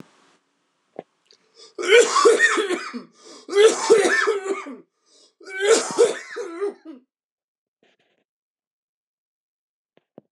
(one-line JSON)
{"three_cough_length": "10.3 s", "three_cough_amplitude": 25814, "three_cough_signal_mean_std_ratio": 0.41, "survey_phase": "beta (2021-08-13 to 2022-03-07)", "age": "45-64", "gender": "Male", "wearing_mask": "No", "symptom_new_continuous_cough": true, "symptom_runny_or_blocked_nose": true, "symptom_sore_throat": true, "symptom_abdominal_pain": true, "symptom_fatigue": true, "symptom_fever_high_temperature": true, "symptom_headache": true, "symptom_change_to_sense_of_smell_or_taste": true, "symptom_other": true, "symptom_onset": "6 days", "smoker_status": "Never smoked", "respiratory_condition_asthma": false, "respiratory_condition_other": false, "recruitment_source": "Test and Trace", "submission_delay": "1 day", "covid_test_result": "Positive", "covid_test_method": "RT-qPCR"}